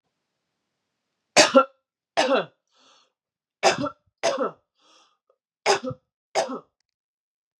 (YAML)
three_cough_length: 7.6 s
three_cough_amplitude: 29601
three_cough_signal_mean_std_ratio: 0.3
survey_phase: beta (2021-08-13 to 2022-03-07)
age: 45-64
gender: Female
wearing_mask: 'No'
symptom_cough_any: true
symptom_headache: true
symptom_other: true
smoker_status: Never smoked
respiratory_condition_asthma: false
respiratory_condition_other: false
recruitment_source: Test and Trace
submission_delay: 2 days
covid_test_result: Positive
covid_test_method: ePCR